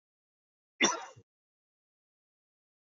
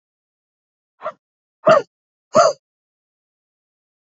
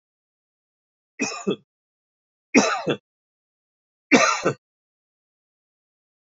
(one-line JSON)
{"cough_length": "2.9 s", "cough_amplitude": 7292, "cough_signal_mean_std_ratio": 0.19, "exhalation_length": "4.2 s", "exhalation_amplitude": 28933, "exhalation_signal_mean_std_ratio": 0.23, "three_cough_length": "6.3 s", "three_cough_amplitude": 29621, "three_cough_signal_mean_std_ratio": 0.28, "survey_phase": "beta (2021-08-13 to 2022-03-07)", "age": "45-64", "gender": "Male", "wearing_mask": "No", "symptom_none": true, "smoker_status": "Never smoked", "respiratory_condition_asthma": false, "respiratory_condition_other": false, "recruitment_source": "REACT", "submission_delay": "1 day", "covid_test_result": "Negative", "covid_test_method": "RT-qPCR", "influenza_a_test_result": "Negative", "influenza_b_test_result": "Negative"}